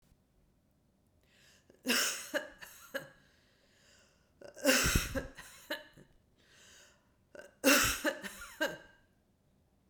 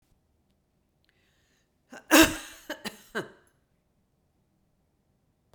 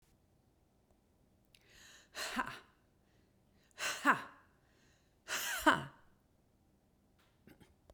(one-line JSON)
{"three_cough_length": "9.9 s", "three_cough_amplitude": 9416, "three_cough_signal_mean_std_ratio": 0.35, "cough_length": "5.5 s", "cough_amplitude": 22820, "cough_signal_mean_std_ratio": 0.19, "exhalation_length": "7.9 s", "exhalation_amplitude": 6117, "exhalation_signal_mean_std_ratio": 0.27, "survey_phase": "beta (2021-08-13 to 2022-03-07)", "age": "65+", "gender": "Female", "wearing_mask": "No", "symptom_sore_throat": true, "symptom_onset": "11 days", "smoker_status": "Never smoked", "respiratory_condition_asthma": false, "respiratory_condition_other": false, "recruitment_source": "REACT", "submission_delay": "7 days", "covid_test_result": "Negative", "covid_test_method": "RT-qPCR"}